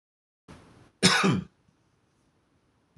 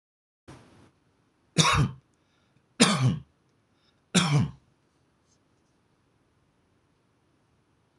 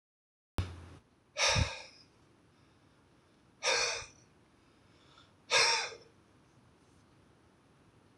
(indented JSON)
{
  "cough_length": "3.0 s",
  "cough_amplitude": 16526,
  "cough_signal_mean_std_ratio": 0.3,
  "three_cough_length": "8.0 s",
  "three_cough_amplitude": 20959,
  "three_cough_signal_mean_std_ratio": 0.3,
  "exhalation_length": "8.2 s",
  "exhalation_amplitude": 6194,
  "exhalation_signal_mean_std_ratio": 0.34,
  "survey_phase": "beta (2021-08-13 to 2022-03-07)",
  "age": "65+",
  "gender": "Male",
  "wearing_mask": "No",
  "symptom_none": true,
  "smoker_status": "Never smoked",
  "respiratory_condition_asthma": false,
  "respiratory_condition_other": false,
  "recruitment_source": "REACT",
  "submission_delay": "1 day",
  "covid_test_result": "Negative",
  "covid_test_method": "RT-qPCR",
  "influenza_a_test_result": "Negative",
  "influenza_b_test_result": "Negative"
}